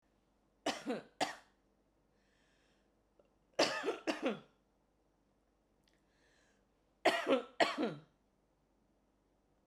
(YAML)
three_cough_length: 9.7 s
three_cough_amplitude: 6281
three_cough_signal_mean_std_ratio: 0.31
survey_phase: beta (2021-08-13 to 2022-03-07)
age: 45-64
gender: Female
wearing_mask: 'No'
symptom_none: true
smoker_status: Current smoker (11 or more cigarettes per day)
respiratory_condition_asthma: false
respiratory_condition_other: false
recruitment_source: REACT
submission_delay: 1 day
covid_test_result: Negative
covid_test_method: RT-qPCR